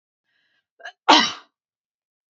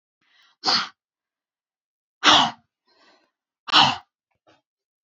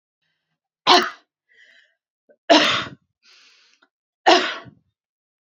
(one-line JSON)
{"cough_length": "2.3 s", "cough_amplitude": 28032, "cough_signal_mean_std_ratio": 0.24, "exhalation_length": "5.0 s", "exhalation_amplitude": 27262, "exhalation_signal_mean_std_ratio": 0.28, "three_cough_length": "5.5 s", "three_cough_amplitude": 30404, "three_cough_signal_mean_std_ratio": 0.29, "survey_phase": "beta (2021-08-13 to 2022-03-07)", "age": "18-44", "gender": "Female", "wearing_mask": "No", "symptom_none": true, "smoker_status": "Never smoked", "respiratory_condition_asthma": false, "respiratory_condition_other": false, "recruitment_source": "REACT", "submission_delay": "1 day", "covid_test_result": "Negative", "covid_test_method": "RT-qPCR", "influenza_a_test_result": "Negative", "influenza_b_test_result": "Negative"}